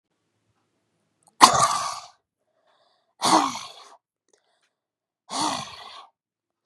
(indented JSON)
{
  "exhalation_length": "6.7 s",
  "exhalation_amplitude": 32768,
  "exhalation_signal_mean_std_ratio": 0.28,
  "survey_phase": "beta (2021-08-13 to 2022-03-07)",
  "age": "18-44",
  "gender": "Female",
  "wearing_mask": "No",
  "symptom_cough_any": true,
  "symptom_runny_or_blocked_nose": true,
  "symptom_sore_throat": true,
  "symptom_headache": true,
  "smoker_status": "Ex-smoker",
  "respiratory_condition_asthma": false,
  "respiratory_condition_other": false,
  "recruitment_source": "Test and Trace",
  "submission_delay": "1 day",
  "covid_test_result": "Positive",
  "covid_test_method": "LFT"
}